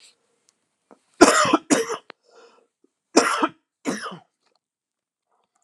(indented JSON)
{
  "cough_length": "5.6 s",
  "cough_amplitude": 32768,
  "cough_signal_mean_std_ratio": 0.3,
  "survey_phase": "alpha (2021-03-01 to 2021-08-12)",
  "age": "65+",
  "gender": "Male",
  "wearing_mask": "No",
  "symptom_cough_any": true,
  "symptom_headache": true,
  "smoker_status": "Never smoked",
  "respiratory_condition_asthma": true,
  "respiratory_condition_other": false,
  "recruitment_source": "Test and Trace",
  "submission_delay": "2 days",
  "covid_test_result": "Positive",
  "covid_test_method": "RT-qPCR",
  "covid_ct_value": 20.6,
  "covid_ct_gene": "ORF1ab gene",
  "covid_ct_mean": 20.9,
  "covid_viral_load": "140000 copies/ml",
  "covid_viral_load_category": "Low viral load (10K-1M copies/ml)"
}